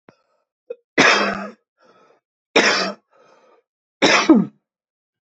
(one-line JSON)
{"three_cough_length": "5.4 s", "three_cough_amplitude": 30728, "three_cough_signal_mean_std_ratio": 0.37, "survey_phase": "beta (2021-08-13 to 2022-03-07)", "age": "18-44", "gender": "Male", "wearing_mask": "No", "symptom_cough_any": true, "symptom_runny_or_blocked_nose": true, "symptom_shortness_of_breath": true, "symptom_sore_throat": true, "smoker_status": "Ex-smoker", "respiratory_condition_asthma": false, "respiratory_condition_other": false, "recruitment_source": "Test and Trace", "submission_delay": "2 days", "covid_test_result": "Positive", "covid_test_method": "RT-qPCR", "covid_ct_value": 32.5, "covid_ct_gene": "N gene"}